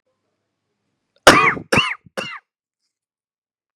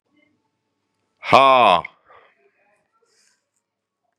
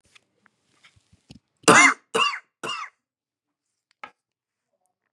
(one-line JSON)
{"cough_length": "3.8 s", "cough_amplitude": 32768, "cough_signal_mean_std_ratio": 0.27, "exhalation_length": "4.2 s", "exhalation_amplitude": 32768, "exhalation_signal_mean_std_ratio": 0.26, "three_cough_length": "5.1 s", "three_cough_amplitude": 32768, "three_cough_signal_mean_std_ratio": 0.24, "survey_phase": "beta (2021-08-13 to 2022-03-07)", "age": "65+", "gender": "Male", "wearing_mask": "No", "symptom_runny_or_blocked_nose": true, "smoker_status": "Never smoked", "respiratory_condition_asthma": false, "respiratory_condition_other": false, "recruitment_source": "Test and Trace", "submission_delay": "2 days", "covid_test_result": "Positive", "covid_test_method": "RT-qPCR", "covid_ct_value": 14.0, "covid_ct_gene": "ORF1ab gene"}